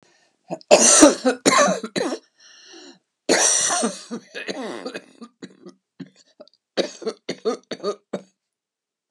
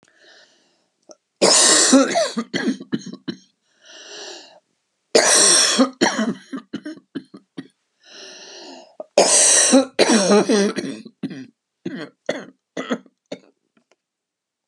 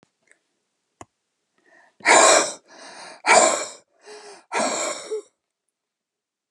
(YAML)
cough_length: 9.1 s
cough_amplitude: 32768
cough_signal_mean_std_ratio: 0.4
three_cough_length: 14.7 s
three_cough_amplitude: 32154
three_cough_signal_mean_std_ratio: 0.46
exhalation_length: 6.5 s
exhalation_amplitude: 28861
exhalation_signal_mean_std_ratio: 0.35
survey_phase: beta (2021-08-13 to 2022-03-07)
age: 65+
gender: Female
wearing_mask: 'No'
symptom_none: true
smoker_status: Never smoked
respiratory_condition_asthma: false
respiratory_condition_other: false
recruitment_source: REACT
submission_delay: 1 day
covid_test_result: Negative
covid_test_method: RT-qPCR